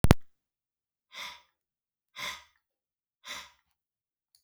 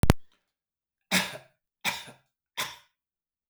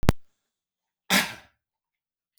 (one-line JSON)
{"exhalation_length": "4.4 s", "exhalation_amplitude": 32768, "exhalation_signal_mean_std_ratio": 0.19, "three_cough_length": "3.5 s", "three_cough_amplitude": 32767, "three_cough_signal_mean_std_ratio": 0.29, "cough_length": "2.4 s", "cough_amplitude": 32768, "cough_signal_mean_std_ratio": 0.29, "survey_phase": "beta (2021-08-13 to 2022-03-07)", "age": "65+", "gender": "Male", "wearing_mask": "No", "symptom_none": true, "smoker_status": "Ex-smoker", "respiratory_condition_asthma": false, "respiratory_condition_other": false, "recruitment_source": "REACT", "submission_delay": "5 days", "covid_test_result": "Negative", "covid_test_method": "RT-qPCR", "influenza_a_test_result": "Negative", "influenza_b_test_result": "Negative"}